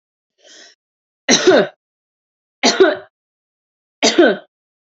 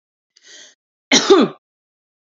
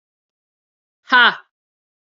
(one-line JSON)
{"three_cough_length": "4.9 s", "three_cough_amplitude": 32767, "three_cough_signal_mean_std_ratio": 0.35, "cough_length": "2.3 s", "cough_amplitude": 31841, "cough_signal_mean_std_ratio": 0.31, "exhalation_length": "2.0 s", "exhalation_amplitude": 28874, "exhalation_signal_mean_std_ratio": 0.25, "survey_phase": "alpha (2021-03-01 to 2021-08-12)", "age": "45-64", "gender": "Female", "wearing_mask": "No", "symptom_change_to_sense_of_smell_or_taste": true, "symptom_onset": "4 days", "smoker_status": "Never smoked", "respiratory_condition_asthma": false, "respiratory_condition_other": false, "recruitment_source": "Test and Trace", "submission_delay": "1 day", "covid_test_result": "Positive", "covid_test_method": "RT-qPCR"}